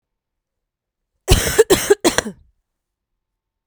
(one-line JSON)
{"cough_length": "3.7 s", "cough_amplitude": 32768, "cough_signal_mean_std_ratio": 0.3, "survey_phase": "beta (2021-08-13 to 2022-03-07)", "age": "18-44", "gender": "Female", "wearing_mask": "No", "symptom_cough_any": true, "symptom_runny_or_blocked_nose": true, "symptom_sore_throat": true, "symptom_fatigue": true, "symptom_headache": true, "symptom_change_to_sense_of_smell_or_taste": true, "symptom_loss_of_taste": true, "symptom_onset": "4 days", "smoker_status": "Ex-smoker", "respiratory_condition_asthma": true, "respiratory_condition_other": false, "recruitment_source": "Test and Trace", "submission_delay": "1 day", "covid_test_result": "Positive", "covid_test_method": "RT-qPCR", "covid_ct_value": 14.9, "covid_ct_gene": "ORF1ab gene", "covid_ct_mean": 15.3, "covid_viral_load": "9300000 copies/ml", "covid_viral_load_category": "High viral load (>1M copies/ml)"}